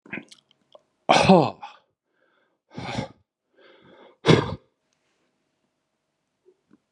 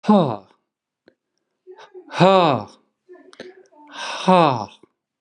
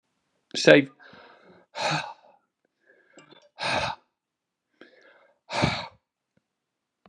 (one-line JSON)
{"three_cough_length": "6.9 s", "three_cough_amplitude": 29617, "three_cough_signal_mean_std_ratio": 0.24, "exhalation_length": "5.2 s", "exhalation_amplitude": 30860, "exhalation_signal_mean_std_ratio": 0.35, "cough_length": "7.1 s", "cough_amplitude": 32704, "cough_signal_mean_std_ratio": 0.26, "survey_phase": "beta (2021-08-13 to 2022-03-07)", "age": "45-64", "gender": "Male", "wearing_mask": "No", "symptom_cough_any": true, "symptom_runny_or_blocked_nose": true, "symptom_fatigue": true, "symptom_change_to_sense_of_smell_or_taste": true, "smoker_status": "Never smoked", "respiratory_condition_asthma": false, "respiratory_condition_other": false, "recruitment_source": "Test and Trace", "submission_delay": "3 days", "covid_test_result": "Positive", "covid_test_method": "RT-qPCR", "covid_ct_value": 29.4, "covid_ct_gene": "ORF1ab gene", "covid_ct_mean": 29.8, "covid_viral_load": "170 copies/ml", "covid_viral_load_category": "Minimal viral load (< 10K copies/ml)"}